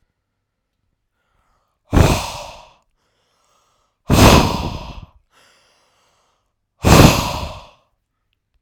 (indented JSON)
{
  "exhalation_length": "8.6 s",
  "exhalation_amplitude": 32768,
  "exhalation_signal_mean_std_ratio": 0.31,
  "survey_phase": "alpha (2021-03-01 to 2021-08-12)",
  "age": "18-44",
  "gender": "Male",
  "wearing_mask": "No",
  "symptom_none": true,
  "smoker_status": "Never smoked",
  "respiratory_condition_asthma": false,
  "respiratory_condition_other": false,
  "recruitment_source": "REACT",
  "submission_delay": "6 days",
  "covid_test_result": "Negative",
  "covid_test_method": "RT-qPCR"
}